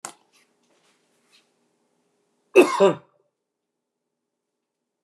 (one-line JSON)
{"cough_length": "5.0 s", "cough_amplitude": 27269, "cough_signal_mean_std_ratio": 0.19, "survey_phase": "alpha (2021-03-01 to 2021-08-12)", "age": "65+", "gender": "Male", "wearing_mask": "No", "symptom_none": true, "smoker_status": "Never smoked", "respiratory_condition_asthma": false, "respiratory_condition_other": false, "recruitment_source": "REACT", "submission_delay": "2 days", "covid_test_result": "Negative", "covid_test_method": "RT-qPCR"}